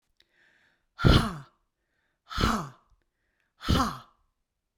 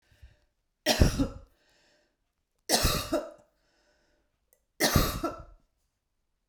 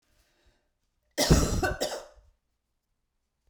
{"exhalation_length": "4.8 s", "exhalation_amplitude": 18802, "exhalation_signal_mean_std_ratio": 0.32, "three_cough_length": "6.5 s", "three_cough_amplitude": 17045, "three_cough_signal_mean_std_ratio": 0.35, "cough_length": "3.5 s", "cough_amplitude": 15632, "cough_signal_mean_std_ratio": 0.34, "survey_phase": "beta (2021-08-13 to 2022-03-07)", "age": "65+", "gender": "Female", "wearing_mask": "No", "symptom_cough_any": true, "symptom_runny_or_blocked_nose": true, "smoker_status": "Ex-smoker", "respiratory_condition_asthma": false, "respiratory_condition_other": false, "recruitment_source": "REACT", "submission_delay": "1 day", "covid_test_result": "Negative", "covid_test_method": "RT-qPCR"}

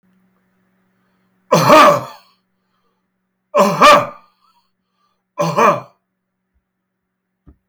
{"three_cough_length": "7.7 s", "three_cough_amplitude": 32768, "three_cough_signal_mean_std_ratio": 0.34, "survey_phase": "beta (2021-08-13 to 2022-03-07)", "age": "65+", "gender": "Male", "wearing_mask": "No", "symptom_cough_any": true, "smoker_status": "Ex-smoker", "respiratory_condition_asthma": false, "respiratory_condition_other": false, "recruitment_source": "REACT", "submission_delay": "3 days", "covid_test_result": "Negative", "covid_test_method": "RT-qPCR", "influenza_a_test_result": "Negative", "influenza_b_test_result": "Negative"}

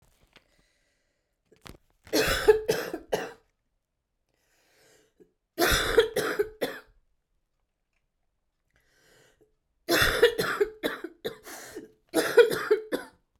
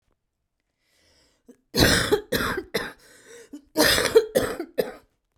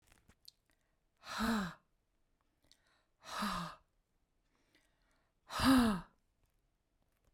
{"three_cough_length": "13.4 s", "three_cough_amplitude": 17667, "three_cough_signal_mean_std_ratio": 0.37, "cough_length": "5.4 s", "cough_amplitude": 22914, "cough_signal_mean_std_ratio": 0.43, "exhalation_length": "7.3 s", "exhalation_amplitude": 4261, "exhalation_signal_mean_std_ratio": 0.31, "survey_phase": "beta (2021-08-13 to 2022-03-07)", "age": "45-64", "gender": "Female", "wearing_mask": "No", "symptom_cough_any": true, "symptom_runny_or_blocked_nose": true, "symptom_sore_throat": true, "symptom_fatigue": true, "symptom_fever_high_temperature": true, "symptom_headache": true, "symptom_change_to_sense_of_smell_or_taste": true, "symptom_onset": "4 days", "smoker_status": "Ex-smoker", "respiratory_condition_asthma": false, "respiratory_condition_other": false, "recruitment_source": "Test and Trace", "submission_delay": "2 days", "covid_test_result": "Positive", "covid_test_method": "RT-qPCR", "covid_ct_value": 24.5, "covid_ct_gene": "ORF1ab gene", "covid_ct_mean": 25.2, "covid_viral_load": "5600 copies/ml", "covid_viral_load_category": "Minimal viral load (< 10K copies/ml)"}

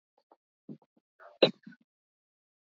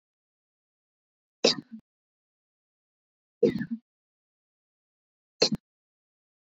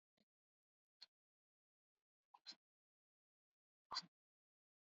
{"cough_length": "2.6 s", "cough_amplitude": 14661, "cough_signal_mean_std_ratio": 0.13, "three_cough_length": "6.6 s", "three_cough_amplitude": 13536, "three_cough_signal_mean_std_ratio": 0.19, "exhalation_length": "4.9 s", "exhalation_amplitude": 758, "exhalation_signal_mean_std_ratio": 0.14, "survey_phase": "beta (2021-08-13 to 2022-03-07)", "age": "18-44", "gender": "Female", "wearing_mask": "No", "symptom_none": true, "smoker_status": "Never smoked", "respiratory_condition_asthma": false, "respiratory_condition_other": false, "recruitment_source": "REACT", "submission_delay": "2 days", "covid_test_result": "Negative", "covid_test_method": "RT-qPCR"}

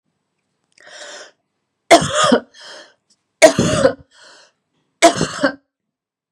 {"three_cough_length": "6.3 s", "three_cough_amplitude": 32768, "three_cough_signal_mean_std_ratio": 0.33, "survey_phase": "beta (2021-08-13 to 2022-03-07)", "age": "18-44", "gender": "Female", "wearing_mask": "No", "symptom_cough_any": true, "symptom_runny_or_blocked_nose": true, "symptom_fatigue": true, "smoker_status": "Never smoked", "respiratory_condition_asthma": false, "respiratory_condition_other": false, "recruitment_source": "Test and Trace", "submission_delay": "2 days", "covid_test_result": "Negative", "covid_test_method": "ePCR"}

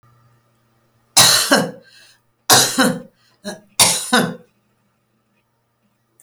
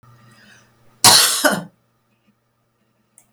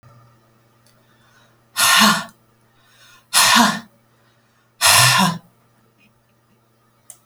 {"three_cough_length": "6.2 s", "three_cough_amplitude": 32768, "three_cough_signal_mean_std_ratio": 0.37, "cough_length": "3.3 s", "cough_amplitude": 32768, "cough_signal_mean_std_ratio": 0.31, "exhalation_length": "7.3 s", "exhalation_amplitude": 32768, "exhalation_signal_mean_std_ratio": 0.37, "survey_phase": "beta (2021-08-13 to 2022-03-07)", "age": "65+", "gender": "Female", "wearing_mask": "No", "symptom_none": true, "smoker_status": "Never smoked", "respiratory_condition_asthma": false, "respiratory_condition_other": false, "recruitment_source": "REACT", "submission_delay": "1 day", "covid_test_result": "Negative", "covid_test_method": "RT-qPCR"}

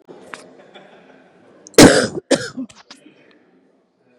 {"cough_length": "4.2 s", "cough_amplitude": 32768, "cough_signal_mean_std_ratio": 0.26, "survey_phase": "beta (2021-08-13 to 2022-03-07)", "age": "45-64", "gender": "Female", "wearing_mask": "No", "symptom_new_continuous_cough": true, "symptom_runny_or_blocked_nose": true, "symptom_diarrhoea": true, "symptom_fatigue": true, "symptom_loss_of_taste": true, "symptom_onset": "5 days", "smoker_status": "Ex-smoker", "respiratory_condition_asthma": false, "respiratory_condition_other": false, "recruitment_source": "Test and Trace", "submission_delay": "3 days", "covid_test_result": "Negative", "covid_test_method": "RT-qPCR"}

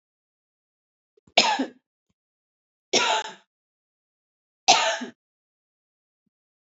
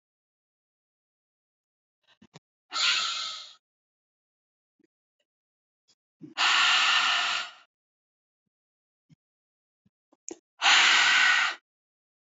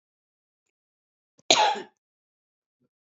{"three_cough_length": "6.7 s", "three_cough_amplitude": 32105, "three_cough_signal_mean_std_ratio": 0.27, "exhalation_length": "12.2 s", "exhalation_amplitude": 13839, "exhalation_signal_mean_std_ratio": 0.37, "cough_length": "3.2 s", "cough_amplitude": 25427, "cough_signal_mean_std_ratio": 0.22, "survey_phase": "beta (2021-08-13 to 2022-03-07)", "age": "45-64", "gender": "Female", "wearing_mask": "No", "symptom_none": true, "smoker_status": "Ex-smoker", "respiratory_condition_asthma": false, "respiratory_condition_other": false, "recruitment_source": "REACT", "submission_delay": "0 days", "covid_test_result": "Negative", "covid_test_method": "RT-qPCR"}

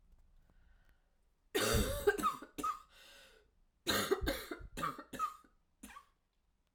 {"cough_length": "6.7 s", "cough_amplitude": 3980, "cough_signal_mean_std_ratio": 0.45, "survey_phase": "alpha (2021-03-01 to 2021-08-12)", "age": "45-64", "gender": "Female", "wearing_mask": "No", "symptom_cough_any": true, "symptom_fatigue": true, "symptom_headache": true, "smoker_status": "Ex-smoker", "respiratory_condition_asthma": false, "respiratory_condition_other": false, "recruitment_source": "Test and Trace", "submission_delay": "1 day", "covid_test_result": "Positive", "covid_test_method": "LFT"}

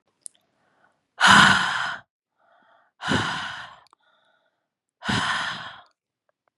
{"exhalation_length": "6.6 s", "exhalation_amplitude": 30911, "exhalation_signal_mean_std_ratio": 0.35, "survey_phase": "beta (2021-08-13 to 2022-03-07)", "age": "18-44", "gender": "Female", "wearing_mask": "No", "symptom_cough_any": true, "symptom_runny_or_blocked_nose": true, "symptom_sore_throat": true, "symptom_abdominal_pain": true, "symptom_fatigue": true, "smoker_status": "Never smoked", "respiratory_condition_asthma": false, "respiratory_condition_other": false, "recruitment_source": "Test and Trace", "submission_delay": "2 days", "covid_test_result": "Positive", "covid_test_method": "RT-qPCR", "covid_ct_value": 17.9, "covid_ct_gene": "ORF1ab gene", "covid_ct_mean": 18.2, "covid_viral_load": "1100000 copies/ml", "covid_viral_load_category": "High viral load (>1M copies/ml)"}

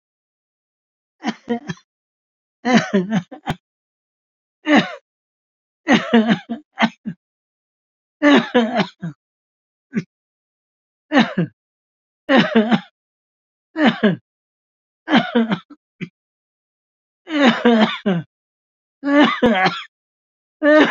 {"cough_length": "20.9 s", "cough_amplitude": 31336, "cough_signal_mean_std_ratio": 0.4, "survey_phase": "beta (2021-08-13 to 2022-03-07)", "age": "65+", "gender": "Male", "wearing_mask": "No", "symptom_cough_any": true, "symptom_runny_or_blocked_nose": true, "symptom_sore_throat": true, "symptom_abdominal_pain": true, "symptom_headache": true, "symptom_onset": "12 days", "smoker_status": "Ex-smoker", "respiratory_condition_asthma": false, "respiratory_condition_other": false, "recruitment_source": "REACT", "submission_delay": "3 days", "covid_test_result": "Negative", "covid_test_method": "RT-qPCR", "influenza_a_test_result": "Negative", "influenza_b_test_result": "Negative"}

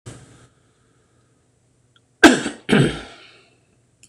{"cough_length": "4.1 s", "cough_amplitude": 26028, "cough_signal_mean_std_ratio": 0.26, "survey_phase": "beta (2021-08-13 to 2022-03-07)", "age": "65+", "gender": "Male", "wearing_mask": "No", "symptom_cough_any": true, "symptom_runny_or_blocked_nose": true, "smoker_status": "Ex-smoker", "respiratory_condition_asthma": false, "respiratory_condition_other": true, "recruitment_source": "Test and Trace", "submission_delay": "1 day", "covid_test_result": "Negative", "covid_test_method": "RT-qPCR"}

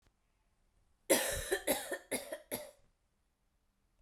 {"cough_length": "4.0 s", "cough_amplitude": 6074, "cough_signal_mean_std_ratio": 0.37, "survey_phase": "beta (2021-08-13 to 2022-03-07)", "age": "18-44", "gender": "Female", "wearing_mask": "No", "symptom_runny_or_blocked_nose": true, "symptom_sore_throat": true, "symptom_headache": true, "symptom_onset": "4 days", "smoker_status": "Ex-smoker", "respiratory_condition_asthma": false, "respiratory_condition_other": false, "recruitment_source": "Test and Trace", "submission_delay": "2 days", "covid_test_result": "Positive", "covid_test_method": "RT-qPCR", "covid_ct_value": 28.9, "covid_ct_gene": "N gene"}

